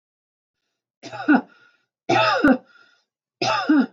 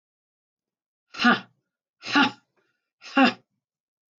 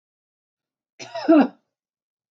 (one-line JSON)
{"three_cough_length": "3.9 s", "three_cough_amplitude": 19205, "three_cough_signal_mean_std_ratio": 0.43, "exhalation_length": "4.2 s", "exhalation_amplitude": 19418, "exhalation_signal_mean_std_ratio": 0.28, "cough_length": "2.3 s", "cough_amplitude": 16181, "cough_signal_mean_std_ratio": 0.27, "survey_phase": "beta (2021-08-13 to 2022-03-07)", "age": "45-64", "gender": "Female", "wearing_mask": "No", "symptom_none": true, "symptom_onset": "11 days", "smoker_status": "Ex-smoker", "respiratory_condition_asthma": false, "respiratory_condition_other": false, "recruitment_source": "REACT", "submission_delay": "2 days", "covid_test_result": "Negative", "covid_test_method": "RT-qPCR", "influenza_a_test_result": "Unknown/Void", "influenza_b_test_result": "Unknown/Void"}